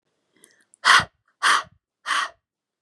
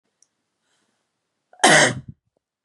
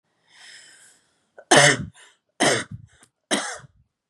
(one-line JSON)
{"exhalation_length": "2.8 s", "exhalation_amplitude": 27011, "exhalation_signal_mean_std_ratio": 0.34, "cough_length": "2.6 s", "cough_amplitude": 31348, "cough_signal_mean_std_ratio": 0.27, "three_cough_length": "4.1 s", "three_cough_amplitude": 31474, "three_cough_signal_mean_std_ratio": 0.32, "survey_phase": "beta (2021-08-13 to 2022-03-07)", "age": "18-44", "gender": "Female", "wearing_mask": "No", "symptom_cough_any": true, "symptom_onset": "7 days", "smoker_status": "Never smoked", "respiratory_condition_asthma": false, "respiratory_condition_other": false, "recruitment_source": "Test and Trace", "submission_delay": "2 days", "covid_test_result": "Negative", "covid_test_method": "RT-qPCR"}